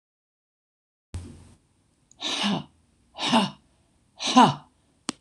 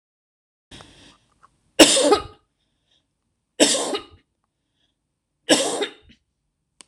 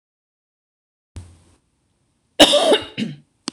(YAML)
exhalation_length: 5.2 s
exhalation_amplitude: 24859
exhalation_signal_mean_std_ratio: 0.31
three_cough_length: 6.9 s
three_cough_amplitude: 26028
three_cough_signal_mean_std_ratio: 0.29
cough_length: 3.5 s
cough_amplitude: 26028
cough_signal_mean_std_ratio: 0.3
survey_phase: beta (2021-08-13 to 2022-03-07)
age: 65+
gender: Female
wearing_mask: 'No'
symptom_none: true
smoker_status: Never smoked
respiratory_condition_asthma: false
respiratory_condition_other: false
recruitment_source: REACT
submission_delay: 0 days
covid_test_result: Negative
covid_test_method: RT-qPCR
covid_ct_value: 45.0
covid_ct_gene: E gene